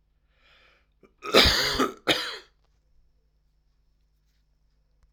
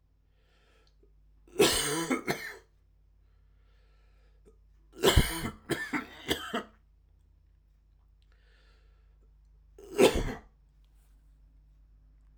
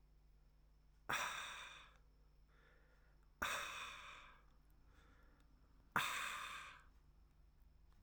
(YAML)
cough_length: 5.1 s
cough_amplitude: 24533
cough_signal_mean_std_ratio: 0.3
three_cough_length: 12.4 s
three_cough_amplitude: 13707
three_cough_signal_mean_std_ratio: 0.32
exhalation_length: 8.0 s
exhalation_amplitude: 2526
exhalation_signal_mean_std_ratio: 0.47
survey_phase: alpha (2021-03-01 to 2021-08-12)
age: 45-64
gender: Male
wearing_mask: 'No'
symptom_cough_any: true
symptom_fever_high_temperature: true
symptom_change_to_sense_of_smell_or_taste: true
symptom_loss_of_taste: true
symptom_onset: 3 days
smoker_status: Never smoked
respiratory_condition_asthma: false
respiratory_condition_other: false
recruitment_source: Test and Trace
submission_delay: 1 day
covid_test_result: Positive
covid_test_method: RT-qPCR
covid_ct_value: 15.9
covid_ct_gene: ORF1ab gene
covid_ct_mean: 16.4
covid_viral_load: 4200000 copies/ml
covid_viral_load_category: High viral load (>1M copies/ml)